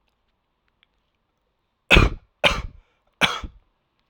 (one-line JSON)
{"three_cough_length": "4.1 s", "three_cough_amplitude": 32768, "three_cough_signal_mean_std_ratio": 0.26, "survey_phase": "alpha (2021-03-01 to 2021-08-12)", "age": "18-44", "gender": "Male", "wearing_mask": "No", "symptom_cough_any": true, "symptom_fatigue": true, "symptom_fever_high_temperature": true, "symptom_headache": true, "smoker_status": "Never smoked", "respiratory_condition_asthma": false, "respiratory_condition_other": false, "recruitment_source": "Test and Trace", "submission_delay": "2 days", "covid_test_result": "Positive", "covid_test_method": "RT-qPCR", "covid_ct_value": 20.7, "covid_ct_gene": "N gene"}